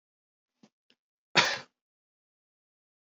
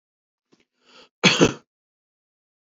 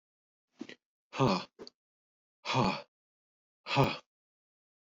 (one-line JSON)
{"cough_length": "3.2 s", "cough_amplitude": 12131, "cough_signal_mean_std_ratio": 0.18, "three_cough_length": "2.7 s", "three_cough_amplitude": 26873, "three_cough_signal_mean_std_ratio": 0.23, "exhalation_length": "4.9 s", "exhalation_amplitude": 7570, "exhalation_signal_mean_std_ratio": 0.33, "survey_phase": "beta (2021-08-13 to 2022-03-07)", "age": "65+", "gender": "Male", "wearing_mask": "No", "symptom_none": true, "smoker_status": "Never smoked", "respiratory_condition_asthma": false, "respiratory_condition_other": false, "recruitment_source": "REACT", "submission_delay": "2 days", "covid_test_result": "Negative", "covid_test_method": "RT-qPCR"}